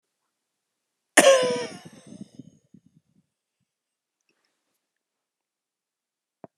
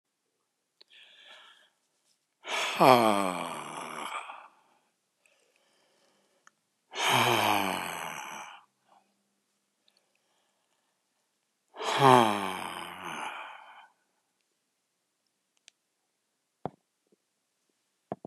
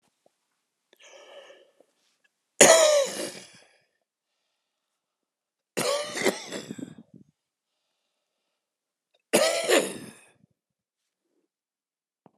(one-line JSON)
{"cough_length": "6.6 s", "cough_amplitude": 32392, "cough_signal_mean_std_ratio": 0.2, "exhalation_length": "18.3 s", "exhalation_amplitude": 20743, "exhalation_signal_mean_std_ratio": 0.29, "three_cough_length": "12.4 s", "three_cough_amplitude": 29481, "three_cough_signal_mean_std_ratio": 0.28, "survey_phase": "alpha (2021-03-01 to 2021-08-12)", "age": "65+", "gender": "Male", "wearing_mask": "No", "symptom_none": true, "smoker_status": "Ex-smoker", "respiratory_condition_asthma": false, "respiratory_condition_other": true, "recruitment_source": "REACT", "submission_delay": "2 days", "covid_test_result": "Negative", "covid_test_method": "RT-qPCR"}